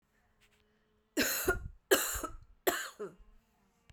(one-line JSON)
{"three_cough_length": "3.9 s", "three_cough_amplitude": 9288, "three_cough_signal_mean_std_ratio": 0.4, "survey_phase": "beta (2021-08-13 to 2022-03-07)", "age": "18-44", "gender": "Female", "wearing_mask": "No", "symptom_cough_any": true, "symptom_runny_or_blocked_nose": true, "symptom_diarrhoea": true, "symptom_headache": true, "symptom_loss_of_taste": true, "smoker_status": "Never smoked", "respiratory_condition_asthma": true, "respiratory_condition_other": false, "recruitment_source": "Test and Trace", "submission_delay": "3 days", "covid_test_result": "Positive", "covid_test_method": "RT-qPCR", "covid_ct_value": 28.4, "covid_ct_gene": "ORF1ab gene", "covid_ct_mean": 29.2, "covid_viral_load": "270 copies/ml", "covid_viral_load_category": "Minimal viral load (< 10K copies/ml)"}